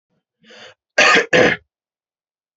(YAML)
cough_length: 2.6 s
cough_amplitude: 29393
cough_signal_mean_std_ratio: 0.36
survey_phase: alpha (2021-03-01 to 2021-08-12)
age: 45-64
gender: Male
wearing_mask: 'No'
symptom_none: true
smoker_status: Never smoked
respiratory_condition_asthma: false
respiratory_condition_other: false
recruitment_source: REACT
submission_delay: 1 day
covid_test_result: Negative
covid_test_method: RT-qPCR